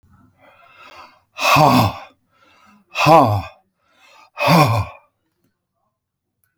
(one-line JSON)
{"exhalation_length": "6.6 s", "exhalation_amplitude": 30620, "exhalation_signal_mean_std_ratio": 0.39, "survey_phase": "alpha (2021-03-01 to 2021-08-12)", "age": "65+", "gender": "Male", "wearing_mask": "No", "symptom_none": true, "smoker_status": "Ex-smoker", "respiratory_condition_asthma": false, "respiratory_condition_other": false, "recruitment_source": "REACT", "submission_delay": "1 day", "covid_test_result": "Negative", "covid_test_method": "RT-qPCR"}